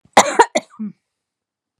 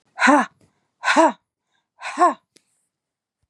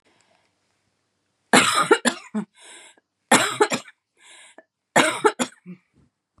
cough_length: 1.8 s
cough_amplitude: 32768
cough_signal_mean_std_ratio: 0.29
exhalation_length: 3.5 s
exhalation_amplitude: 25774
exhalation_signal_mean_std_ratio: 0.36
three_cough_length: 6.4 s
three_cough_amplitude: 30174
three_cough_signal_mean_std_ratio: 0.34
survey_phase: beta (2021-08-13 to 2022-03-07)
age: 45-64
gender: Female
wearing_mask: 'No'
symptom_none: true
smoker_status: Never smoked
respiratory_condition_asthma: true
respiratory_condition_other: false
recruitment_source: Test and Trace
submission_delay: 2 days
covid_test_result: Negative
covid_test_method: RT-qPCR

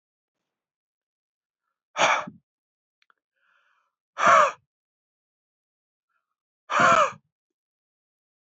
exhalation_length: 8.5 s
exhalation_amplitude: 18187
exhalation_signal_mean_std_ratio: 0.26
survey_phase: beta (2021-08-13 to 2022-03-07)
age: 45-64
gender: Male
wearing_mask: 'No'
symptom_none: true
smoker_status: Never smoked
respiratory_condition_asthma: false
respiratory_condition_other: false
recruitment_source: REACT
submission_delay: 1 day
covid_test_result: Negative
covid_test_method: RT-qPCR
influenza_a_test_result: Negative
influenza_b_test_result: Negative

